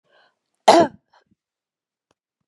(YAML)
cough_length: 2.5 s
cough_amplitude: 32767
cough_signal_mean_std_ratio: 0.22
survey_phase: beta (2021-08-13 to 2022-03-07)
age: 65+
gender: Female
wearing_mask: 'No'
symptom_none: true
smoker_status: Ex-smoker
respiratory_condition_asthma: false
respiratory_condition_other: false
recruitment_source: REACT
submission_delay: 2 days
covid_test_result: Negative
covid_test_method: RT-qPCR